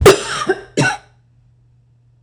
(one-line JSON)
{"cough_length": "2.2 s", "cough_amplitude": 26028, "cough_signal_mean_std_ratio": 0.39, "survey_phase": "beta (2021-08-13 to 2022-03-07)", "age": "45-64", "gender": "Female", "wearing_mask": "No", "symptom_none": true, "smoker_status": "Never smoked", "respiratory_condition_asthma": false, "respiratory_condition_other": false, "recruitment_source": "REACT", "submission_delay": "4 days", "covid_test_result": "Negative", "covid_test_method": "RT-qPCR"}